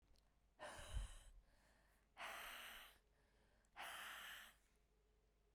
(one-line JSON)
{"exhalation_length": "5.5 s", "exhalation_amplitude": 460, "exhalation_signal_mean_std_ratio": 0.57, "survey_phase": "beta (2021-08-13 to 2022-03-07)", "age": "18-44", "gender": "Female", "wearing_mask": "No", "symptom_cough_any": true, "symptom_new_continuous_cough": true, "symptom_sore_throat": true, "symptom_fatigue": true, "symptom_headache": true, "symptom_onset": "3 days", "smoker_status": "Never smoked", "respiratory_condition_asthma": false, "respiratory_condition_other": false, "recruitment_source": "Test and Trace", "submission_delay": "0 days", "covid_test_result": "Positive", "covid_test_method": "LAMP"}